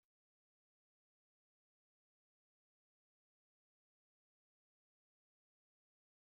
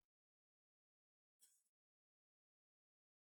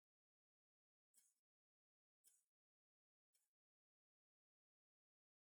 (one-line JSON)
{"exhalation_length": "6.2 s", "exhalation_amplitude": 1, "exhalation_signal_mean_std_ratio": 0.03, "cough_length": "3.3 s", "cough_amplitude": 44, "cough_signal_mean_std_ratio": 0.18, "three_cough_length": "5.6 s", "three_cough_amplitude": 43, "three_cough_signal_mean_std_ratio": 0.18, "survey_phase": "beta (2021-08-13 to 2022-03-07)", "age": "45-64", "gender": "Male", "wearing_mask": "No", "symptom_none": true, "smoker_status": "Ex-smoker", "respiratory_condition_asthma": false, "respiratory_condition_other": false, "recruitment_source": "REACT", "submission_delay": "3 days", "covid_test_result": "Negative", "covid_test_method": "RT-qPCR"}